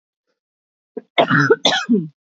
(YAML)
three_cough_length: 2.4 s
three_cough_amplitude: 26981
three_cough_signal_mean_std_ratio: 0.44
survey_phase: beta (2021-08-13 to 2022-03-07)
age: 18-44
gender: Female
wearing_mask: 'No'
symptom_headache: true
smoker_status: Never smoked
respiratory_condition_asthma: false
respiratory_condition_other: false
recruitment_source: REACT
submission_delay: 0 days
covid_test_result: Negative
covid_test_method: RT-qPCR
influenza_a_test_result: Negative
influenza_b_test_result: Negative